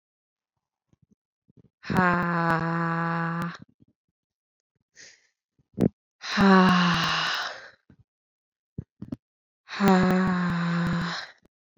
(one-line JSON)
{"exhalation_length": "11.8 s", "exhalation_amplitude": 22188, "exhalation_signal_mean_std_ratio": 0.48, "survey_phase": "beta (2021-08-13 to 2022-03-07)", "age": "45-64", "gender": "Female", "wearing_mask": "No", "symptom_runny_or_blocked_nose": true, "symptom_fatigue": true, "symptom_headache": true, "smoker_status": "Never smoked", "respiratory_condition_asthma": false, "respiratory_condition_other": false, "recruitment_source": "Test and Trace", "submission_delay": "1 day", "covid_test_result": "Positive", "covid_test_method": "ePCR"}